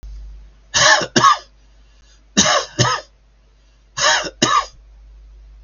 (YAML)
three_cough_length: 5.6 s
three_cough_amplitude: 32768
three_cough_signal_mean_std_ratio: 0.45
survey_phase: beta (2021-08-13 to 2022-03-07)
age: 65+
gender: Male
wearing_mask: 'No'
symptom_none: true
smoker_status: Never smoked
respiratory_condition_asthma: false
respiratory_condition_other: false
recruitment_source: REACT
submission_delay: 2 days
covid_test_result: Negative
covid_test_method: RT-qPCR
influenza_a_test_result: Negative
influenza_b_test_result: Negative